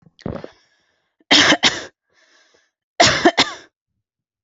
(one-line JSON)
{"cough_length": "4.4 s", "cough_amplitude": 32767, "cough_signal_mean_std_ratio": 0.34, "survey_phase": "alpha (2021-03-01 to 2021-08-12)", "age": "18-44", "gender": "Female", "wearing_mask": "No", "symptom_none": true, "smoker_status": "Never smoked", "respiratory_condition_asthma": false, "respiratory_condition_other": false, "recruitment_source": "REACT", "submission_delay": "1 day", "covid_test_result": "Negative", "covid_test_method": "RT-qPCR"}